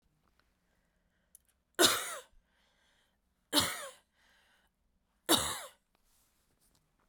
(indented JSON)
{
  "three_cough_length": "7.1 s",
  "three_cough_amplitude": 8720,
  "three_cough_signal_mean_std_ratio": 0.26,
  "survey_phase": "beta (2021-08-13 to 2022-03-07)",
  "age": "18-44",
  "gender": "Female",
  "wearing_mask": "No",
  "symptom_cough_any": true,
  "symptom_new_continuous_cough": true,
  "symptom_runny_or_blocked_nose": true,
  "symptom_shortness_of_breath": true,
  "symptom_sore_throat": true,
  "symptom_fatigue": true,
  "symptom_headache": true,
  "symptom_change_to_sense_of_smell_or_taste": true,
  "smoker_status": "Never smoked",
  "respiratory_condition_asthma": true,
  "respiratory_condition_other": false,
  "recruitment_source": "Test and Trace",
  "submission_delay": "2 days",
  "covid_test_result": "Positive",
  "covid_test_method": "RT-qPCR",
  "covid_ct_value": 21.6,
  "covid_ct_gene": "ORF1ab gene",
  "covid_ct_mean": 22.1,
  "covid_viral_load": "56000 copies/ml",
  "covid_viral_load_category": "Low viral load (10K-1M copies/ml)"
}